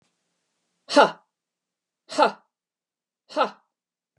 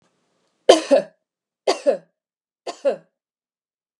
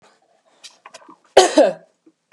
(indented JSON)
{
  "exhalation_length": "4.2 s",
  "exhalation_amplitude": 27295,
  "exhalation_signal_mean_std_ratio": 0.23,
  "three_cough_length": "4.0 s",
  "three_cough_amplitude": 32768,
  "three_cough_signal_mean_std_ratio": 0.27,
  "cough_length": "2.3 s",
  "cough_amplitude": 32768,
  "cough_signal_mean_std_ratio": 0.29,
  "survey_phase": "beta (2021-08-13 to 2022-03-07)",
  "age": "45-64",
  "gender": "Female",
  "wearing_mask": "No",
  "symptom_none": true,
  "smoker_status": "Ex-smoker",
  "respiratory_condition_asthma": true,
  "respiratory_condition_other": false,
  "recruitment_source": "REACT",
  "submission_delay": "1 day",
  "covid_test_result": "Negative",
  "covid_test_method": "RT-qPCR",
  "influenza_a_test_result": "Unknown/Void",
  "influenza_b_test_result": "Unknown/Void"
}